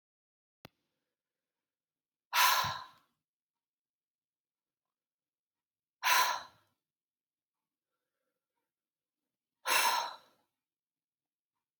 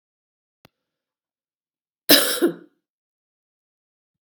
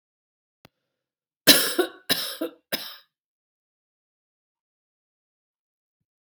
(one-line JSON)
{"exhalation_length": "11.8 s", "exhalation_amplitude": 7761, "exhalation_signal_mean_std_ratio": 0.25, "cough_length": "4.4 s", "cough_amplitude": 32767, "cough_signal_mean_std_ratio": 0.21, "three_cough_length": "6.2 s", "three_cough_amplitude": 32768, "three_cough_signal_mean_std_ratio": 0.22, "survey_phase": "beta (2021-08-13 to 2022-03-07)", "age": "45-64", "gender": "Female", "wearing_mask": "No", "symptom_none": true, "smoker_status": "Ex-smoker", "respiratory_condition_asthma": true, "respiratory_condition_other": false, "recruitment_source": "REACT", "submission_delay": "2 days", "covid_test_result": "Negative", "covid_test_method": "RT-qPCR", "influenza_a_test_result": "Negative", "influenza_b_test_result": "Negative"}